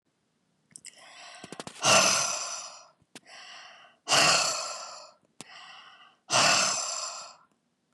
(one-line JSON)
{"exhalation_length": "7.9 s", "exhalation_amplitude": 11820, "exhalation_signal_mean_std_ratio": 0.45, "survey_phase": "beta (2021-08-13 to 2022-03-07)", "age": "45-64", "gender": "Female", "wearing_mask": "No", "symptom_cough_any": true, "symptom_runny_or_blocked_nose": true, "symptom_sore_throat": true, "symptom_fatigue": true, "symptom_headache": true, "smoker_status": "Never smoked", "respiratory_condition_asthma": false, "respiratory_condition_other": false, "recruitment_source": "Test and Trace", "submission_delay": "1 day", "covid_test_result": "Positive", "covid_test_method": "ePCR"}